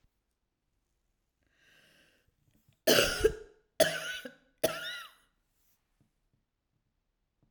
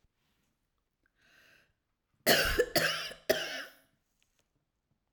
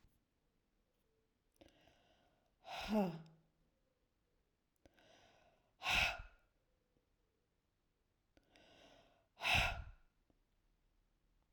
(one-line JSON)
{"three_cough_length": "7.5 s", "three_cough_amplitude": 13451, "three_cough_signal_mean_std_ratio": 0.26, "cough_length": "5.1 s", "cough_amplitude": 9634, "cough_signal_mean_std_ratio": 0.33, "exhalation_length": "11.5 s", "exhalation_amplitude": 2267, "exhalation_signal_mean_std_ratio": 0.27, "survey_phase": "alpha (2021-03-01 to 2021-08-12)", "age": "45-64", "gender": "Female", "wearing_mask": "No", "symptom_none": true, "smoker_status": "Never smoked", "respiratory_condition_asthma": false, "respiratory_condition_other": false, "recruitment_source": "REACT", "submission_delay": "3 days", "covid_test_result": "Negative", "covid_test_method": "RT-qPCR"}